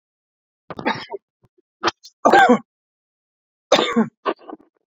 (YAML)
three_cough_length: 4.9 s
three_cough_amplitude: 32767
three_cough_signal_mean_std_ratio: 0.33
survey_phase: beta (2021-08-13 to 2022-03-07)
age: 45-64
gender: Male
wearing_mask: 'No'
symptom_none: true
smoker_status: Never smoked
respiratory_condition_asthma: false
respiratory_condition_other: false
recruitment_source: REACT
submission_delay: 1 day
covid_test_result: Negative
covid_test_method: RT-qPCR